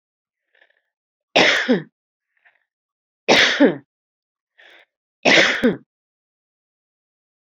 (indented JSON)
{
  "three_cough_length": "7.4 s",
  "three_cough_amplitude": 32486,
  "three_cough_signal_mean_std_ratio": 0.33,
  "survey_phase": "beta (2021-08-13 to 2022-03-07)",
  "age": "45-64",
  "gender": "Female",
  "wearing_mask": "No",
  "symptom_headache": true,
  "symptom_onset": "12 days",
  "smoker_status": "Ex-smoker",
  "respiratory_condition_asthma": false,
  "respiratory_condition_other": false,
  "recruitment_source": "REACT",
  "submission_delay": "2 days",
  "covid_test_result": "Negative",
  "covid_test_method": "RT-qPCR",
  "influenza_a_test_result": "Negative",
  "influenza_b_test_result": "Negative"
}